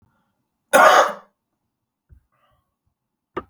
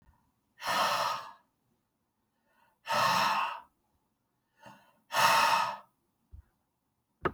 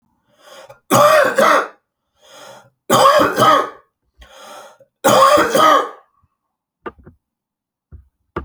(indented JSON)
{
  "cough_length": "3.5 s",
  "cough_amplitude": 32373,
  "cough_signal_mean_std_ratio": 0.27,
  "exhalation_length": "7.3 s",
  "exhalation_amplitude": 9880,
  "exhalation_signal_mean_std_ratio": 0.43,
  "three_cough_length": "8.4 s",
  "three_cough_amplitude": 32649,
  "three_cough_signal_mean_std_ratio": 0.46,
  "survey_phase": "beta (2021-08-13 to 2022-03-07)",
  "age": "45-64",
  "gender": "Male",
  "wearing_mask": "No",
  "symptom_cough_any": true,
  "symptom_runny_or_blocked_nose": true,
  "symptom_sore_throat": true,
  "symptom_onset": "12 days",
  "smoker_status": "Ex-smoker",
  "respiratory_condition_asthma": false,
  "respiratory_condition_other": false,
  "recruitment_source": "REACT",
  "submission_delay": "0 days",
  "covid_test_result": "Negative",
  "covid_test_method": "RT-qPCR"
}